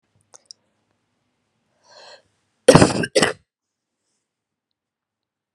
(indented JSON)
{
  "cough_length": "5.5 s",
  "cough_amplitude": 32768,
  "cough_signal_mean_std_ratio": 0.2,
  "survey_phase": "beta (2021-08-13 to 2022-03-07)",
  "age": "18-44",
  "gender": "Female",
  "wearing_mask": "No",
  "symptom_cough_any": true,
  "symptom_runny_or_blocked_nose": true,
  "symptom_shortness_of_breath": true,
  "symptom_abdominal_pain": true,
  "symptom_fatigue": true,
  "symptom_fever_high_temperature": true,
  "symptom_headache": true,
  "symptom_other": true,
  "smoker_status": "Ex-smoker",
  "respiratory_condition_asthma": true,
  "respiratory_condition_other": false,
  "recruitment_source": "Test and Trace",
  "submission_delay": "2 days",
  "covid_test_result": "Positive",
  "covid_test_method": "LFT"
}